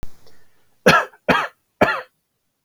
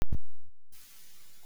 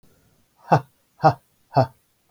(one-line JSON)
{"three_cough_length": "2.6 s", "three_cough_amplitude": 32768, "three_cough_signal_mean_std_ratio": 0.38, "cough_length": "1.5 s", "cough_amplitude": 4159, "cough_signal_mean_std_ratio": 0.8, "exhalation_length": "2.3 s", "exhalation_amplitude": 25839, "exhalation_signal_mean_std_ratio": 0.28, "survey_phase": "beta (2021-08-13 to 2022-03-07)", "age": "45-64", "gender": "Male", "wearing_mask": "No", "symptom_none": true, "smoker_status": "Ex-smoker", "respiratory_condition_asthma": false, "respiratory_condition_other": false, "recruitment_source": "REACT", "submission_delay": "3 days", "covid_test_result": "Negative", "covid_test_method": "RT-qPCR", "influenza_a_test_result": "Negative", "influenza_b_test_result": "Negative"}